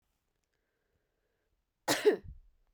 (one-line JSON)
{"cough_length": "2.7 s", "cough_amplitude": 6647, "cough_signal_mean_std_ratio": 0.24, "survey_phase": "beta (2021-08-13 to 2022-03-07)", "age": "45-64", "gender": "Female", "wearing_mask": "No", "symptom_cough_any": true, "symptom_new_continuous_cough": true, "symptom_runny_or_blocked_nose": true, "symptom_shortness_of_breath": true, "symptom_sore_throat": true, "symptom_fatigue": true, "symptom_headache": true, "symptom_change_to_sense_of_smell_or_taste": true, "symptom_loss_of_taste": true, "symptom_onset": "3 days", "smoker_status": "Ex-smoker", "respiratory_condition_asthma": false, "respiratory_condition_other": false, "recruitment_source": "Test and Trace", "submission_delay": "1 day", "covid_test_result": "Positive", "covid_test_method": "RT-qPCR", "covid_ct_value": 28.8, "covid_ct_gene": "N gene"}